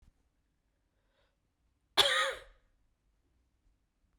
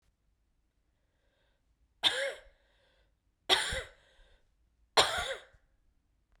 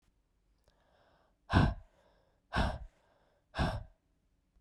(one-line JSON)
{"cough_length": "4.2 s", "cough_amplitude": 9624, "cough_signal_mean_std_ratio": 0.23, "three_cough_length": "6.4 s", "three_cough_amplitude": 12368, "three_cough_signal_mean_std_ratio": 0.28, "exhalation_length": "4.6 s", "exhalation_amplitude": 8747, "exhalation_signal_mean_std_ratio": 0.31, "survey_phase": "beta (2021-08-13 to 2022-03-07)", "age": "18-44", "gender": "Male", "wearing_mask": "No", "symptom_cough_any": true, "symptom_runny_or_blocked_nose": true, "symptom_sore_throat": true, "symptom_fatigue": true, "symptom_headache": true, "symptom_change_to_sense_of_smell_or_taste": true, "symptom_loss_of_taste": true, "symptom_onset": "8 days", "smoker_status": "Never smoked", "respiratory_condition_asthma": false, "respiratory_condition_other": false, "recruitment_source": "Test and Trace", "submission_delay": "7 days", "covid_test_result": "Positive", "covid_test_method": "ePCR"}